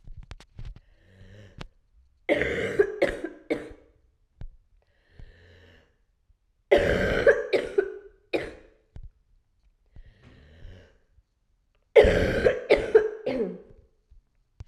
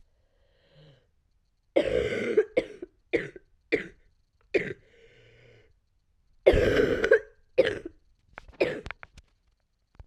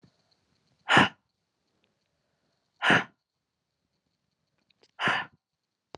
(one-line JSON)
{"three_cough_length": "14.7 s", "three_cough_amplitude": 23819, "three_cough_signal_mean_std_ratio": 0.36, "cough_length": "10.1 s", "cough_amplitude": 20208, "cough_signal_mean_std_ratio": 0.35, "exhalation_length": "6.0 s", "exhalation_amplitude": 21219, "exhalation_signal_mean_std_ratio": 0.24, "survey_phase": "beta (2021-08-13 to 2022-03-07)", "age": "45-64", "gender": "Female", "wearing_mask": "No", "symptom_cough_any": true, "symptom_runny_or_blocked_nose": true, "symptom_fatigue": true, "symptom_headache": true, "symptom_other": true, "smoker_status": "Never smoked", "respiratory_condition_asthma": true, "respiratory_condition_other": false, "recruitment_source": "Test and Trace", "submission_delay": "2 days", "covid_test_result": "Positive", "covid_test_method": "RT-qPCR", "covid_ct_value": 33.0, "covid_ct_gene": "N gene"}